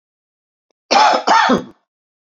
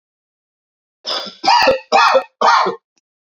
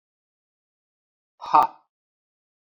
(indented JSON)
{
  "cough_length": "2.2 s",
  "cough_amplitude": 32768,
  "cough_signal_mean_std_ratio": 0.46,
  "three_cough_length": "3.3 s",
  "three_cough_amplitude": 30010,
  "three_cough_signal_mean_std_ratio": 0.49,
  "exhalation_length": "2.6 s",
  "exhalation_amplitude": 26501,
  "exhalation_signal_mean_std_ratio": 0.19,
  "survey_phase": "beta (2021-08-13 to 2022-03-07)",
  "age": "65+",
  "gender": "Male",
  "wearing_mask": "No",
  "symptom_cough_any": true,
  "symptom_sore_throat": true,
  "symptom_onset": "3 days",
  "smoker_status": "Never smoked",
  "respiratory_condition_asthma": true,
  "respiratory_condition_other": false,
  "recruitment_source": "Test and Trace",
  "submission_delay": "2 days",
  "covid_test_result": "Positive",
  "covid_test_method": "RT-qPCR",
  "covid_ct_value": 19.3,
  "covid_ct_gene": "N gene"
}